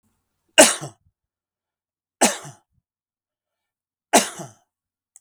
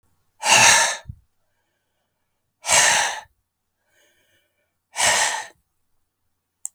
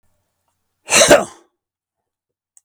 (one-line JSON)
{"three_cough_length": "5.2 s", "three_cough_amplitude": 32768, "three_cough_signal_mean_std_ratio": 0.21, "exhalation_length": "6.7 s", "exhalation_amplitude": 32665, "exhalation_signal_mean_std_ratio": 0.36, "cough_length": "2.6 s", "cough_amplitude": 32768, "cough_signal_mean_std_ratio": 0.28, "survey_phase": "beta (2021-08-13 to 2022-03-07)", "age": "65+", "gender": "Male", "wearing_mask": "No", "symptom_none": true, "smoker_status": "Never smoked", "respiratory_condition_asthma": false, "respiratory_condition_other": false, "recruitment_source": "REACT", "submission_delay": "2 days", "covid_test_result": "Negative", "covid_test_method": "RT-qPCR"}